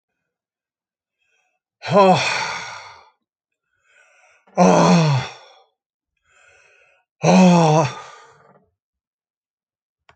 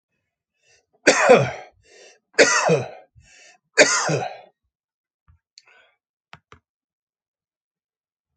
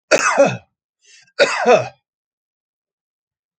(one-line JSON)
{"exhalation_length": "10.2 s", "exhalation_amplitude": 29073, "exhalation_signal_mean_std_ratio": 0.37, "three_cough_length": "8.4 s", "three_cough_amplitude": 32768, "three_cough_signal_mean_std_ratio": 0.3, "cough_length": "3.6 s", "cough_amplitude": 30033, "cough_signal_mean_std_ratio": 0.38, "survey_phase": "alpha (2021-03-01 to 2021-08-12)", "age": "65+", "gender": "Male", "wearing_mask": "No", "symptom_cough_any": true, "smoker_status": "Never smoked", "respiratory_condition_asthma": false, "respiratory_condition_other": false, "recruitment_source": "REACT", "submission_delay": "2 days", "covid_test_result": "Negative", "covid_test_method": "RT-qPCR"}